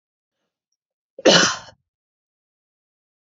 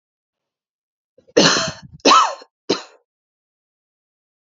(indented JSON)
{
  "cough_length": "3.2 s",
  "cough_amplitude": 29227,
  "cough_signal_mean_std_ratio": 0.23,
  "three_cough_length": "4.5 s",
  "three_cough_amplitude": 32704,
  "three_cough_signal_mean_std_ratio": 0.3,
  "survey_phase": "beta (2021-08-13 to 2022-03-07)",
  "age": "18-44",
  "gender": "Female",
  "wearing_mask": "No",
  "symptom_none": true,
  "smoker_status": "Never smoked",
  "respiratory_condition_asthma": false,
  "respiratory_condition_other": false,
  "recruitment_source": "REACT",
  "submission_delay": "2 days",
  "covid_test_result": "Negative",
  "covid_test_method": "RT-qPCR"
}